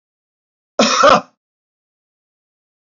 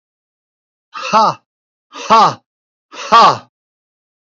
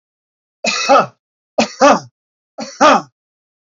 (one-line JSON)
{"cough_length": "3.0 s", "cough_amplitude": 28487, "cough_signal_mean_std_ratio": 0.29, "exhalation_length": "4.4 s", "exhalation_amplitude": 29120, "exhalation_signal_mean_std_ratio": 0.36, "three_cough_length": "3.8 s", "three_cough_amplitude": 30438, "three_cough_signal_mean_std_ratio": 0.4, "survey_phase": "alpha (2021-03-01 to 2021-08-12)", "age": "65+", "gender": "Male", "wearing_mask": "No", "symptom_none": true, "smoker_status": "Ex-smoker", "respiratory_condition_asthma": false, "respiratory_condition_other": false, "recruitment_source": "REACT", "submission_delay": "2 days", "covid_test_result": "Negative", "covid_test_method": "RT-qPCR"}